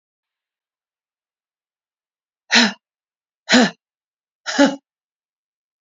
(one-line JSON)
{"exhalation_length": "5.8 s", "exhalation_amplitude": 31625, "exhalation_signal_mean_std_ratio": 0.25, "survey_phase": "beta (2021-08-13 to 2022-03-07)", "age": "18-44", "gender": "Female", "wearing_mask": "No", "symptom_none": true, "smoker_status": "Never smoked", "respiratory_condition_asthma": false, "respiratory_condition_other": false, "recruitment_source": "REACT", "submission_delay": "1 day", "covid_test_result": "Negative", "covid_test_method": "RT-qPCR"}